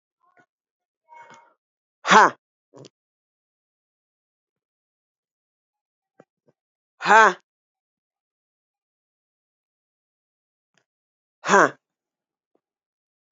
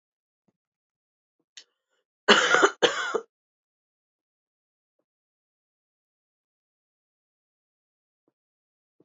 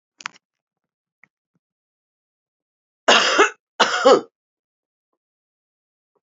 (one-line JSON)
{"exhalation_length": "13.3 s", "exhalation_amplitude": 31083, "exhalation_signal_mean_std_ratio": 0.16, "three_cough_length": "9.0 s", "three_cough_amplitude": 25930, "three_cough_signal_mean_std_ratio": 0.2, "cough_length": "6.2 s", "cough_amplitude": 30246, "cough_signal_mean_std_ratio": 0.26, "survey_phase": "beta (2021-08-13 to 2022-03-07)", "age": "45-64", "gender": "Female", "wearing_mask": "No", "symptom_runny_or_blocked_nose": true, "symptom_fatigue": true, "symptom_headache": true, "smoker_status": "Current smoker (1 to 10 cigarettes per day)", "respiratory_condition_asthma": false, "respiratory_condition_other": false, "recruitment_source": "Test and Trace", "submission_delay": "1 day", "covid_test_result": "Positive", "covid_test_method": "RT-qPCR", "covid_ct_value": 25.7, "covid_ct_gene": "ORF1ab gene", "covid_ct_mean": 26.8, "covid_viral_load": "1700 copies/ml", "covid_viral_load_category": "Minimal viral load (< 10K copies/ml)"}